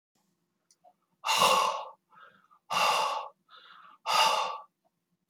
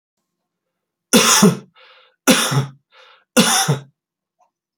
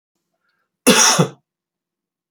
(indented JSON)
{
  "exhalation_length": "5.3 s",
  "exhalation_amplitude": 10141,
  "exhalation_signal_mean_std_ratio": 0.46,
  "three_cough_length": "4.8 s",
  "three_cough_amplitude": 32768,
  "three_cough_signal_mean_std_ratio": 0.41,
  "cough_length": "2.3 s",
  "cough_amplitude": 32631,
  "cough_signal_mean_std_ratio": 0.34,
  "survey_phase": "beta (2021-08-13 to 2022-03-07)",
  "age": "45-64",
  "gender": "Male",
  "wearing_mask": "No",
  "symptom_none": true,
  "smoker_status": "Never smoked",
  "respiratory_condition_asthma": false,
  "respiratory_condition_other": false,
  "recruitment_source": "REACT",
  "submission_delay": "1 day",
  "covid_test_result": "Positive",
  "covid_test_method": "RT-qPCR",
  "covid_ct_value": 35.0,
  "covid_ct_gene": "N gene",
  "influenza_a_test_result": "Negative",
  "influenza_b_test_result": "Negative"
}